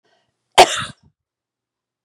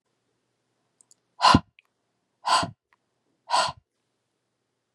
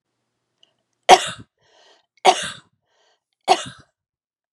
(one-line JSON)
{"cough_length": "2.0 s", "cough_amplitude": 32768, "cough_signal_mean_std_ratio": 0.21, "exhalation_length": "4.9 s", "exhalation_amplitude": 24928, "exhalation_signal_mean_std_ratio": 0.25, "three_cough_length": "4.5 s", "three_cough_amplitude": 32768, "three_cough_signal_mean_std_ratio": 0.22, "survey_phase": "beta (2021-08-13 to 2022-03-07)", "age": "45-64", "gender": "Female", "wearing_mask": "No", "symptom_none": true, "smoker_status": "Never smoked", "respiratory_condition_asthma": false, "respiratory_condition_other": false, "recruitment_source": "REACT", "submission_delay": "1 day", "covid_test_result": "Negative", "covid_test_method": "RT-qPCR"}